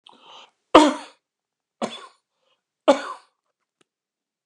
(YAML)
three_cough_length: 4.5 s
three_cough_amplitude: 29204
three_cough_signal_mean_std_ratio: 0.21
survey_phase: beta (2021-08-13 to 2022-03-07)
age: 45-64
gender: Male
wearing_mask: 'No'
symptom_none: true
smoker_status: Never smoked
respiratory_condition_asthma: false
respiratory_condition_other: false
recruitment_source: REACT
submission_delay: 6 days
covid_test_result: Negative
covid_test_method: RT-qPCR